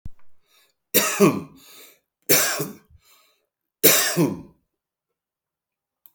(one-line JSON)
{"three_cough_length": "6.1 s", "three_cough_amplitude": 32768, "three_cough_signal_mean_std_ratio": 0.36, "survey_phase": "beta (2021-08-13 to 2022-03-07)", "age": "45-64", "gender": "Male", "wearing_mask": "No", "symptom_none": true, "smoker_status": "Current smoker (11 or more cigarettes per day)", "respiratory_condition_asthma": false, "respiratory_condition_other": false, "recruitment_source": "REACT", "submission_delay": "1 day", "covid_test_result": "Negative", "covid_test_method": "RT-qPCR"}